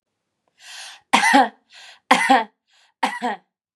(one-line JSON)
{"three_cough_length": "3.8 s", "three_cough_amplitude": 32767, "three_cough_signal_mean_std_ratio": 0.39, "survey_phase": "beta (2021-08-13 to 2022-03-07)", "age": "18-44", "gender": "Female", "wearing_mask": "No", "symptom_none": true, "symptom_onset": "6 days", "smoker_status": "Never smoked", "respiratory_condition_asthma": false, "respiratory_condition_other": false, "recruitment_source": "REACT", "submission_delay": "1 day", "covid_test_result": "Positive", "covid_test_method": "RT-qPCR", "covid_ct_value": 29.7, "covid_ct_gene": "E gene", "influenza_a_test_result": "Negative", "influenza_b_test_result": "Negative"}